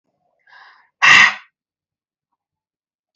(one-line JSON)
{"exhalation_length": "3.2 s", "exhalation_amplitude": 32344, "exhalation_signal_mean_std_ratio": 0.26, "survey_phase": "beta (2021-08-13 to 2022-03-07)", "age": "18-44", "gender": "Female", "wearing_mask": "No", "symptom_none": true, "smoker_status": "Never smoked", "respiratory_condition_asthma": false, "respiratory_condition_other": false, "recruitment_source": "Test and Trace", "submission_delay": "1 day", "covid_test_result": "Positive", "covid_test_method": "RT-qPCR", "covid_ct_value": 28.2, "covid_ct_gene": "S gene", "covid_ct_mean": 28.4, "covid_viral_load": "480 copies/ml", "covid_viral_load_category": "Minimal viral load (< 10K copies/ml)"}